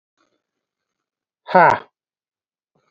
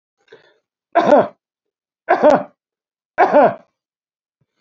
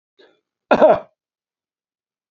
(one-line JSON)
{"exhalation_length": "2.9 s", "exhalation_amplitude": 28539, "exhalation_signal_mean_std_ratio": 0.22, "three_cough_length": "4.6 s", "three_cough_amplitude": 30403, "three_cough_signal_mean_std_ratio": 0.36, "cough_length": "2.3 s", "cough_amplitude": 30817, "cough_signal_mean_std_ratio": 0.26, "survey_phase": "beta (2021-08-13 to 2022-03-07)", "age": "45-64", "gender": "Male", "wearing_mask": "No", "symptom_none": true, "smoker_status": "Never smoked", "respiratory_condition_asthma": false, "respiratory_condition_other": false, "recruitment_source": "REACT", "submission_delay": "2 days", "covid_test_result": "Negative", "covid_test_method": "RT-qPCR"}